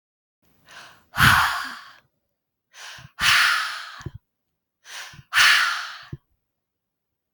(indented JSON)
{
  "exhalation_length": "7.3 s",
  "exhalation_amplitude": 24983,
  "exhalation_signal_mean_std_ratio": 0.39,
  "survey_phase": "alpha (2021-03-01 to 2021-08-12)",
  "age": "45-64",
  "gender": "Female",
  "wearing_mask": "No",
  "symptom_cough_any": true,
  "smoker_status": "Ex-smoker",
  "respiratory_condition_asthma": true,
  "respiratory_condition_other": false,
  "recruitment_source": "REACT",
  "submission_delay": "2 days",
  "covid_test_result": "Negative",
  "covid_test_method": "RT-qPCR"
}